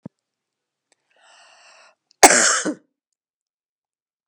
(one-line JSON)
{"cough_length": "4.3 s", "cough_amplitude": 32768, "cough_signal_mean_std_ratio": 0.23, "survey_phase": "beta (2021-08-13 to 2022-03-07)", "age": "45-64", "gender": "Female", "wearing_mask": "No", "symptom_fatigue": true, "symptom_change_to_sense_of_smell_or_taste": true, "symptom_loss_of_taste": true, "symptom_onset": "5 days", "smoker_status": "Ex-smoker", "respiratory_condition_asthma": false, "respiratory_condition_other": false, "recruitment_source": "Test and Trace", "submission_delay": "2 days", "covid_test_result": "Positive", "covid_test_method": "RT-qPCR", "covid_ct_value": 18.5, "covid_ct_gene": "ORF1ab gene", "covid_ct_mean": 19.1, "covid_viral_load": "550000 copies/ml", "covid_viral_load_category": "Low viral load (10K-1M copies/ml)"}